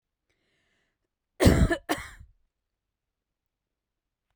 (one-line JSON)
{"cough_length": "4.4 s", "cough_amplitude": 19181, "cough_signal_mean_std_ratio": 0.24, "survey_phase": "beta (2021-08-13 to 2022-03-07)", "age": "18-44", "gender": "Female", "wearing_mask": "No", "symptom_none": true, "smoker_status": "Never smoked", "respiratory_condition_asthma": false, "respiratory_condition_other": false, "recruitment_source": "REACT", "submission_delay": "2 days", "covid_test_result": "Negative", "covid_test_method": "RT-qPCR"}